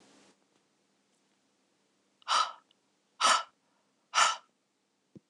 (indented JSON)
{
  "exhalation_length": "5.3 s",
  "exhalation_amplitude": 8970,
  "exhalation_signal_mean_std_ratio": 0.27,
  "survey_phase": "beta (2021-08-13 to 2022-03-07)",
  "age": "45-64",
  "gender": "Female",
  "wearing_mask": "No",
  "symptom_none": true,
  "smoker_status": "Never smoked",
  "respiratory_condition_asthma": false,
  "respiratory_condition_other": false,
  "recruitment_source": "REACT",
  "submission_delay": "1 day",
  "covid_test_result": "Negative",
  "covid_test_method": "RT-qPCR",
  "influenza_a_test_result": "Negative",
  "influenza_b_test_result": "Negative"
}